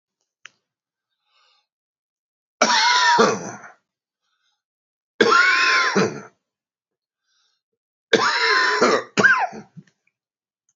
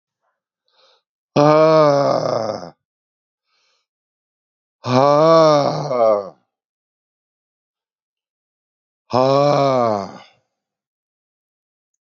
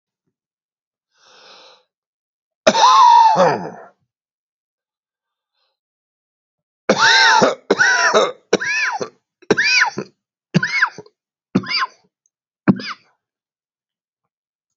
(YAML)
three_cough_length: 10.8 s
three_cough_amplitude: 30668
three_cough_signal_mean_std_ratio: 0.44
exhalation_length: 12.0 s
exhalation_amplitude: 28046
exhalation_signal_mean_std_ratio: 0.42
cough_length: 14.8 s
cough_amplitude: 32590
cough_signal_mean_std_ratio: 0.4
survey_phase: beta (2021-08-13 to 2022-03-07)
age: 65+
gender: Male
wearing_mask: 'No'
symptom_cough_any: true
symptom_fatigue: true
smoker_status: Ex-smoker
respiratory_condition_asthma: false
respiratory_condition_other: true
recruitment_source: Test and Trace
submission_delay: 1 day
covid_test_result: Positive
covid_test_method: LFT